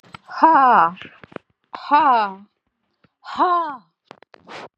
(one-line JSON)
{"exhalation_length": "4.8 s", "exhalation_amplitude": 28401, "exhalation_signal_mean_std_ratio": 0.45, "survey_phase": "beta (2021-08-13 to 2022-03-07)", "age": "65+", "gender": "Female", "wearing_mask": "No", "symptom_cough_any": true, "symptom_sore_throat": true, "symptom_diarrhoea": true, "symptom_fatigue": true, "symptom_headache": true, "symptom_onset": "3 days", "smoker_status": "Never smoked", "respiratory_condition_asthma": false, "respiratory_condition_other": false, "recruitment_source": "Test and Trace", "submission_delay": "0 days", "covid_test_result": "Positive", "covid_test_method": "RT-qPCR", "covid_ct_value": 22.2, "covid_ct_gene": "ORF1ab gene", "covid_ct_mean": 22.6, "covid_viral_load": "38000 copies/ml", "covid_viral_load_category": "Low viral load (10K-1M copies/ml)"}